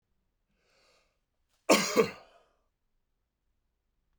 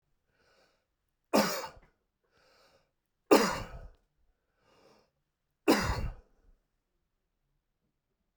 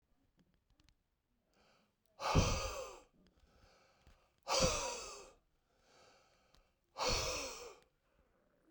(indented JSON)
{
  "cough_length": "4.2 s",
  "cough_amplitude": 12863,
  "cough_signal_mean_std_ratio": 0.22,
  "three_cough_length": "8.4 s",
  "three_cough_amplitude": 12867,
  "three_cough_signal_mean_std_ratio": 0.25,
  "exhalation_length": "8.7 s",
  "exhalation_amplitude": 4172,
  "exhalation_signal_mean_std_ratio": 0.36,
  "survey_phase": "beta (2021-08-13 to 2022-03-07)",
  "age": "65+",
  "gender": "Male",
  "wearing_mask": "No",
  "symptom_none": true,
  "smoker_status": "Never smoked",
  "respiratory_condition_asthma": false,
  "respiratory_condition_other": false,
  "recruitment_source": "REACT",
  "submission_delay": "1 day",
  "covid_test_result": "Negative",
  "covid_test_method": "RT-qPCR"
}